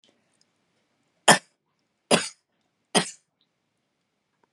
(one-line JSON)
{"three_cough_length": "4.5 s", "three_cough_amplitude": 32114, "three_cough_signal_mean_std_ratio": 0.19, "survey_phase": "beta (2021-08-13 to 2022-03-07)", "age": "45-64", "gender": "Female", "wearing_mask": "No", "symptom_none": true, "symptom_onset": "4 days", "smoker_status": "Ex-smoker", "respiratory_condition_asthma": false, "respiratory_condition_other": false, "recruitment_source": "REACT", "submission_delay": "2 days", "covid_test_result": "Negative", "covid_test_method": "RT-qPCR", "influenza_a_test_result": "Negative", "influenza_b_test_result": "Negative"}